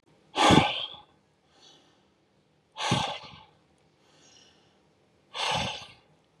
exhalation_length: 6.4 s
exhalation_amplitude: 16783
exhalation_signal_mean_std_ratio: 0.33
survey_phase: beta (2021-08-13 to 2022-03-07)
age: 45-64
gender: Male
wearing_mask: 'No'
symptom_none: true
smoker_status: Ex-smoker
respiratory_condition_asthma: false
respiratory_condition_other: false
recruitment_source: REACT
submission_delay: 2 days
covid_test_result: Negative
covid_test_method: RT-qPCR
influenza_a_test_result: Negative
influenza_b_test_result: Negative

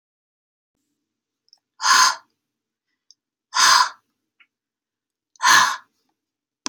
exhalation_length: 6.7 s
exhalation_amplitude: 29395
exhalation_signal_mean_std_ratio: 0.3
survey_phase: beta (2021-08-13 to 2022-03-07)
age: 18-44
gender: Female
wearing_mask: 'No'
symptom_none: true
smoker_status: Never smoked
respiratory_condition_asthma: false
respiratory_condition_other: false
recruitment_source: REACT
submission_delay: 2 days
covid_test_result: Negative
covid_test_method: RT-qPCR
influenza_a_test_result: Negative
influenza_b_test_result: Negative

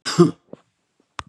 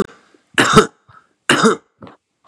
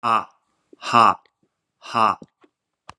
cough_length: 1.3 s
cough_amplitude: 30469
cough_signal_mean_std_ratio: 0.28
three_cough_length: 2.5 s
three_cough_amplitude: 32768
three_cough_signal_mean_std_ratio: 0.38
exhalation_length: 3.0 s
exhalation_amplitude: 30633
exhalation_signal_mean_std_ratio: 0.33
survey_phase: beta (2021-08-13 to 2022-03-07)
age: 65+
gender: Male
wearing_mask: 'No'
symptom_none: true
smoker_status: Never smoked
respiratory_condition_asthma: false
respiratory_condition_other: false
recruitment_source: REACT
submission_delay: 1 day
covid_test_result: Negative
covid_test_method: RT-qPCR
influenza_a_test_result: Negative
influenza_b_test_result: Negative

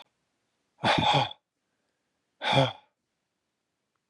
exhalation_length: 4.1 s
exhalation_amplitude: 11345
exhalation_signal_mean_std_ratio: 0.34
survey_phase: beta (2021-08-13 to 2022-03-07)
age: 45-64
gender: Male
wearing_mask: 'No'
symptom_sore_throat: true
smoker_status: Never smoked
respiratory_condition_asthma: true
respiratory_condition_other: false
recruitment_source: Test and Trace
submission_delay: 2 days
covid_test_result: Positive
covid_test_method: LFT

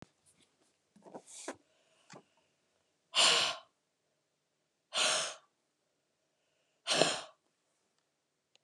exhalation_length: 8.6 s
exhalation_amplitude: 12136
exhalation_signal_mean_std_ratio: 0.29
survey_phase: alpha (2021-03-01 to 2021-08-12)
age: 45-64
gender: Female
wearing_mask: 'No'
symptom_loss_of_taste: true
smoker_status: Never smoked
respiratory_condition_asthma: false
respiratory_condition_other: false
recruitment_source: Test and Trace
submission_delay: 1 day
covid_test_result: Positive
covid_test_method: RT-qPCR
covid_ct_value: 19.8
covid_ct_gene: ORF1ab gene
covid_ct_mean: 20.6
covid_viral_load: 170000 copies/ml
covid_viral_load_category: Low viral load (10K-1M copies/ml)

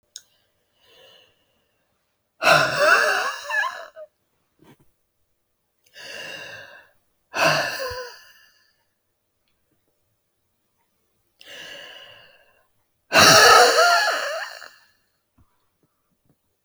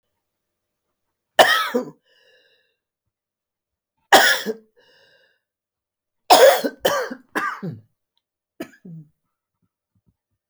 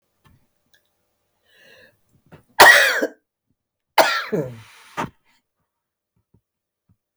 exhalation_length: 16.6 s
exhalation_amplitude: 32768
exhalation_signal_mean_std_ratio: 0.33
three_cough_length: 10.5 s
three_cough_amplitude: 31695
three_cough_signal_mean_std_ratio: 0.28
cough_length: 7.2 s
cough_amplitude: 32768
cough_signal_mean_std_ratio: 0.25
survey_phase: alpha (2021-03-01 to 2021-08-12)
age: 45-64
gender: Female
wearing_mask: 'No'
symptom_none: true
smoker_status: Ex-smoker
recruitment_source: REACT
submission_delay: 32 days
covid_test_result: Negative
covid_test_method: RT-qPCR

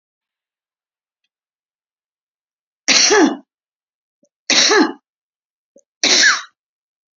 three_cough_length: 7.2 s
three_cough_amplitude: 32768
three_cough_signal_mean_std_ratio: 0.34
survey_phase: beta (2021-08-13 to 2022-03-07)
age: 65+
gender: Female
wearing_mask: 'No'
symptom_cough_any: true
symptom_new_continuous_cough: true
symptom_sore_throat: true
smoker_status: Never smoked
respiratory_condition_asthma: false
respiratory_condition_other: false
recruitment_source: REACT
submission_delay: 2 days
covid_test_result: Positive
covid_test_method: RT-qPCR
covid_ct_value: 33.0
covid_ct_gene: E gene
influenza_a_test_result: Negative
influenza_b_test_result: Negative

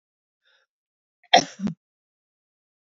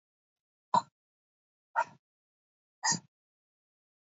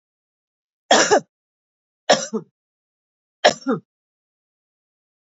cough_length: 2.9 s
cough_amplitude: 31448
cough_signal_mean_std_ratio: 0.17
exhalation_length: 4.0 s
exhalation_amplitude: 6053
exhalation_signal_mean_std_ratio: 0.2
three_cough_length: 5.2 s
three_cough_amplitude: 27920
three_cough_signal_mean_std_ratio: 0.26
survey_phase: beta (2021-08-13 to 2022-03-07)
age: 45-64
gender: Female
wearing_mask: 'No'
symptom_other: true
smoker_status: Ex-smoker
respiratory_condition_asthma: false
respiratory_condition_other: false
recruitment_source: Test and Trace
submission_delay: 1 day
covid_test_result: Negative
covid_test_method: RT-qPCR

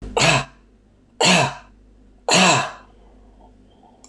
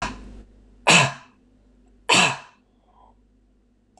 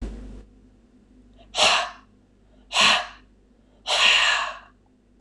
three_cough_length: 4.1 s
three_cough_amplitude: 25832
three_cough_signal_mean_std_ratio: 0.44
cough_length: 4.0 s
cough_amplitude: 24899
cough_signal_mean_std_ratio: 0.31
exhalation_length: 5.2 s
exhalation_amplitude: 21440
exhalation_signal_mean_std_ratio: 0.44
survey_phase: beta (2021-08-13 to 2022-03-07)
age: 45-64
gender: Male
wearing_mask: 'No'
symptom_none: true
smoker_status: Ex-smoker
respiratory_condition_asthma: true
respiratory_condition_other: false
recruitment_source: REACT
submission_delay: 1 day
covid_test_result: Negative
covid_test_method: RT-qPCR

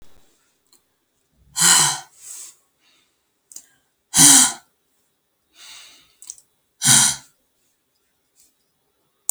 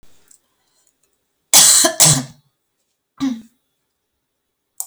exhalation_length: 9.3 s
exhalation_amplitude: 32768
exhalation_signal_mean_std_ratio: 0.27
cough_length: 4.9 s
cough_amplitude: 32768
cough_signal_mean_std_ratio: 0.31
survey_phase: beta (2021-08-13 to 2022-03-07)
age: 45-64
gender: Female
wearing_mask: 'No'
symptom_none: true
smoker_status: Never smoked
respiratory_condition_asthma: false
respiratory_condition_other: false
recruitment_source: REACT
submission_delay: 7 days
covid_test_result: Negative
covid_test_method: RT-qPCR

